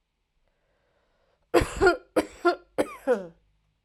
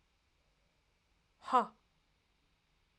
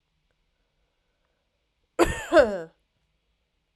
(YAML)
three_cough_length: 3.8 s
three_cough_amplitude: 16448
three_cough_signal_mean_std_ratio: 0.35
exhalation_length: 3.0 s
exhalation_amplitude: 5713
exhalation_signal_mean_std_ratio: 0.17
cough_length: 3.8 s
cough_amplitude: 18040
cough_signal_mean_std_ratio: 0.25
survey_phase: beta (2021-08-13 to 2022-03-07)
age: 18-44
gender: Female
wearing_mask: 'No'
symptom_runny_or_blocked_nose: true
symptom_headache: true
smoker_status: Never smoked
respiratory_condition_asthma: false
respiratory_condition_other: false
recruitment_source: REACT
submission_delay: 2 days
covid_test_result: Negative
covid_test_method: RT-qPCR
influenza_a_test_result: Negative
influenza_b_test_result: Negative